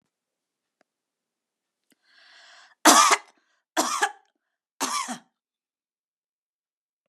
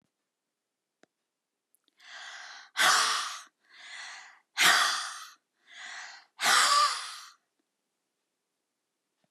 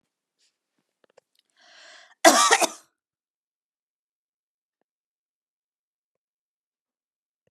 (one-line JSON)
{"three_cough_length": "7.1 s", "three_cough_amplitude": 29605, "three_cough_signal_mean_std_ratio": 0.24, "exhalation_length": "9.3 s", "exhalation_amplitude": 10891, "exhalation_signal_mean_std_ratio": 0.38, "cough_length": "7.5 s", "cough_amplitude": 30994, "cough_signal_mean_std_ratio": 0.17, "survey_phase": "beta (2021-08-13 to 2022-03-07)", "age": "65+", "gender": "Female", "wearing_mask": "No", "symptom_runny_or_blocked_nose": true, "symptom_abdominal_pain": true, "symptom_fatigue": true, "symptom_onset": "12 days", "smoker_status": "Never smoked", "respiratory_condition_asthma": true, "respiratory_condition_other": false, "recruitment_source": "REACT", "submission_delay": "8 days", "covid_test_result": "Negative", "covid_test_method": "RT-qPCR"}